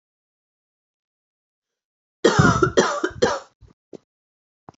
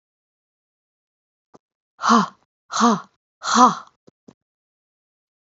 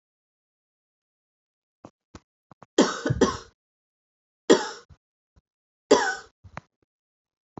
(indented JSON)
{
  "cough_length": "4.8 s",
  "cough_amplitude": 25917,
  "cough_signal_mean_std_ratio": 0.32,
  "exhalation_length": "5.5 s",
  "exhalation_amplitude": 28160,
  "exhalation_signal_mean_std_ratio": 0.29,
  "three_cough_length": "7.6 s",
  "three_cough_amplitude": 24867,
  "three_cough_signal_mean_std_ratio": 0.23,
  "survey_phase": "beta (2021-08-13 to 2022-03-07)",
  "age": "18-44",
  "gender": "Female",
  "wearing_mask": "No",
  "symptom_cough_any": true,
  "symptom_runny_or_blocked_nose": true,
  "symptom_fatigue": true,
  "symptom_headache": true,
  "smoker_status": "Never smoked",
  "respiratory_condition_asthma": false,
  "respiratory_condition_other": false,
  "recruitment_source": "Test and Trace",
  "submission_delay": "2 days",
  "covid_test_result": "Positive",
  "covid_test_method": "RT-qPCR",
  "covid_ct_value": 22.9,
  "covid_ct_gene": "ORF1ab gene"
}